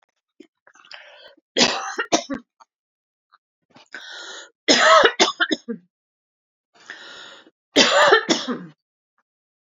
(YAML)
three_cough_length: 9.6 s
three_cough_amplitude: 30808
three_cough_signal_mean_std_ratio: 0.35
survey_phase: alpha (2021-03-01 to 2021-08-12)
age: 45-64
gender: Female
wearing_mask: 'No'
symptom_fatigue: true
smoker_status: Never smoked
recruitment_source: REACT
submission_delay: 3 days
covid_test_result: Negative
covid_test_method: RT-qPCR